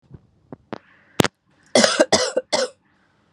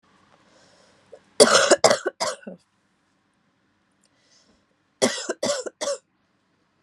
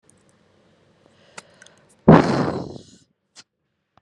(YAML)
cough_length: 3.3 s
cough_amplitude: 32768
cough_signal_mean_std_ratio: 0.34
three_cough_length: 6.8 s
three_cough_amplitude: 32767
three_cough_signal_mean_std_ratio: 0.29
exhalation_length: 4.0 s
exhalation_amplitude: 32768
exhalation_signal_mean_std_ratio: 0.24
survey_phase: beta (2021-08-13 to 2022-03-07)
age: 18-44
gender: Female
wearing_mask: 'No'
symptom_cough_any: true
symptom_runny_or_blocked_nose: true
symptom_shortness_of_breath: true
symptom_sore_throat: true
symptom_fever_high_temperature: true
symptom_headache: true
symptom_other: true
symptom_onset: 3 days
smoker_status: Current smoker (1 to 10 cigarettes per day)
respiratory_condition_asthma: false
respiratory_condition_other: false
recruitment_source: Test and Trace
submission_delay: 1 day
covid_test_result: Positive
covid_test_method: RT-qPCR
covid_ct_value: 15.5
covid_ct_gene: ORF1ab gene
covid_ct_mean: 15.8
covid_viral_load: 6600000 copies/ml
covid_viral_load_category: High viral load (>1M copies/ml)